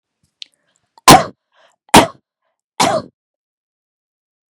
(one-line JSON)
{"three_cough_length": "4.5 s", "three_cough_amplitude": 32768, "three_cough_signal_mean_std_ratio": 0.24, "survey_phase": "beta (2021-08-13 to 2022-03-07)", "age": "45-64", "gender": "Female", "wearing_mask": "No", "symptom_none": true, "smoker_status": "Never smoked", "respiratory_condition_asthma": false, "respiratory_condition_other": false, "recruitment_source": "REACT", "submission_delay": "3 days", "covid_test_result": "Negative", "covid_test_method": "RT-qPCR", "influenza_a_test_result": "Unknown/Void", "influenza_b_test_result": "Unknown/Void"}